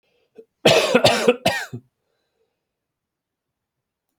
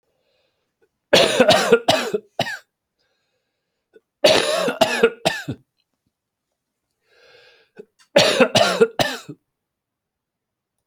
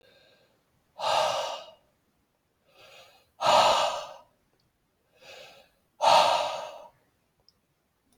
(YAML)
three_cough_length: 4.2 s
three_cough_amplitude: 30630
three_cough_signal_mean_std_ratio: 0.34
cough_length: 10.9 s
cough_amplitude: 32767
cough_signal_mean_std_ratio: 0.38
exhalation_length: 8.2 s
exhalation_amplitude: 14256
exhalation_signal_mean_std_ratio: 0.37
survey_phase: beta (2021-08-13 to 2022-03-07)
age: 45-64
gender: Male
wearing_mask: 'No'
symptom_cough_any: true
symptom_new_continuous_cough: true
symptom_runny_or_blocked_nose: true
symptom_fatigue: true
symptom_headache: true
symptom_onset: 3 days
smoker_status: Never smoked
respiratory_condition_asthma: false
respiratory_condition_other: false
recruitment_source: Test and Trace
submission_delay: 2 days
covid_test_result: Positive
covid_test_method: RT-qPCR